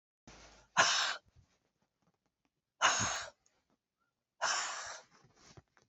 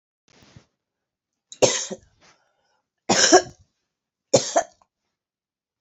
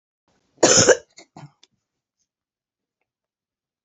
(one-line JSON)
{"exhalation_length": "5.9 s", "exhalation_amplitude": 7362, "exhalation_signal_mean_std_ratio": 0.36, "three_cough_length": "5.8 s", "three_cough_amplitude": 27553, "three_cough_signal_mean_std_ratio": 0.26, "cough_length": "3.8 s", "cough_amplitude": 30195, "cough_signal_mean_std_ratio": 0.23, "survey_phase": "beta (2021-08-13 to 2022-03-07)", "age": "45-64", "gender": "Female", "wearing_mask": "No", "symptom_new_continuous_cough": true, "symptom_runny_or_blocked_nose": true, "symptom_headache": true, "symptom_other": true, "smoker_status": "Never smoked", "respiratory_condition_asthma": false, "respiratory_condition_other": false, "recruitment_source": "Test and Trace", "submission_delay": "1 day", "covid_test_result": "Positive", "covid_test_method": "RT-qPCR", "covid_ct_value": 18.7, "covid_ct_gene": "N gene", "covid_ct_mean": 20.0, "covid_viral_load": "280000 copies/ml", "covid_viral_load_category": "Low viral load (10K-1M copies/ml)"}